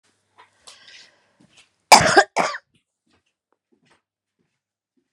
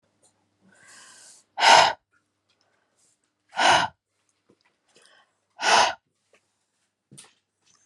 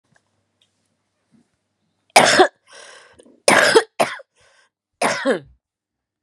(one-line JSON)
{"cough_length": "5.1 s", "cough_amplitude": 32768, "cough_signal_mean_std_ratio": 0.2, "exhalation_length": "7.9 s", "exhalation_amplitude": 27132, "exhalation_signal_mean_std_ratio": 0.27, "three_cough_length": "6.2 s", "three_cough_amplitude": 32768, "three_cough_signal_mean_std_ratio": 0.32, "survey_phase": "beta (2021-08-13 to 2022-03-07)", "age": "45-64", "gender": "Female", "wearing_mask": "No", "symptom_cough_any": true, "symptom_fatigue": true, "symptom_onset": "5 days", "smoker_status": "Never smoked", "respiratory_condition_asthma": false, "respiratory_condition_other": false, "recruitment_source": "REACT", "submission_delay": "1 day", "covid_test_result": "Negative", "covid_test_method": "RT-qPCR"}